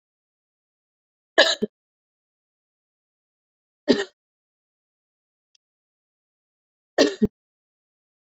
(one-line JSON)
{"three_cough_length": "8.3 s", "three_cough_amplitude": 29535, "three_cough_signal_mean_std_ratio": 0.18, "survey_phase": "beta (2021-08-13 to 2022-03-07)", "age": "45-64", "gender": "Female", "wearing_mask": "No", "symptom_runny_or_blocked_nose": true, "symptom_headache": true, "smoker_status": "Never smoked", "respiratory_condition_asthma": false, "respiratory_condition_other": false, "recruitment_source": "Test and Trace", "submission_delay": "1 day", "covid_test_result": "Positive", "covid_test_method": "ePCR"}